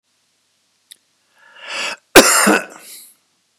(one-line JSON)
{"cough_length": "3.6 s", "cough_amplitude": 32768, "cough_signal_mean_std_ratio": 0.31, "survey_phase": "beta (2021-08-13 to 2022-03-07)", "age": "65+", "gender": "Male", "wearing_mask": "No", "symptom_cough_any": true, "symptom_shortness_of_breath": true, "symptom_fatigue": true, "symptom_headache": true, "symptom_onset": "8 days", "smoker_status": "Never smoked", "respiratory_condition_asthma": false, "respiratory_condition_other": false, "recruitment_source": "REACT", "submission_delay": "1 day", "covid_test_result": "Negative", "covid_test_method": "RT-qPCR"}